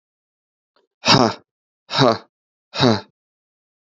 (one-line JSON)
{"exhalation_length": "3.9 s", "exhalation_amplitude": 30093, "exhalation_signal_mean_std_ratio": 0.31, "survey_phase": "alpha (2021-03-01 to 2021-08-12)", "age": "18-44", "gender": "Male", "wearing_mask": "No", "symptom_cough_any": true, "symptom_new_continuous_cough": true, "symptom_fatigue": true, "symptom_fever_high_temperature": true, "symptom_headache": true, "symptom_change_to_sense_of_smell_or_taste": true, "symptom_loss_of_taste": true, "symptom_onset": "3 days", "smoker_status": "Never smoked", "respiratory_condition_asthma": false, "respiratory_condition_other": false, "recruitment_source": "Test and Trace", "submission_delay": "2 days", "covid_ct_value": 27.2, "covid_ct_gene": "ORF1ab gene"}